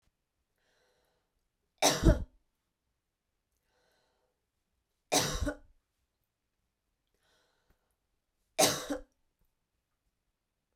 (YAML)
three_cough_length: 10.8 s
three_cough_amplitude: 10326
three_cough_signal_mean_std_ratio: 0.22
survey_phase: beta (2021-08-13 to 2022-03-07)
age: 45-64
gender: Female
wearing_mask: 'No'
symptom_runny_or_blocked_nose: true
symptom_sore_throat: true
symptom_abdominal_pain: true
symptom_fatigue: true
symptom_headache: true
symptom_change_to_sense_of_smell_or_taste: true
symptom_other: true
symptom_onset: 7 days
smoker_status: Ex-smoker
respiratory_condition_asthma: false
respiratory_condition_other: false
recruitment_source: Test and Trace
submission_delay: 2 days
covid_test_result: Positive
covid_test_method: ePCR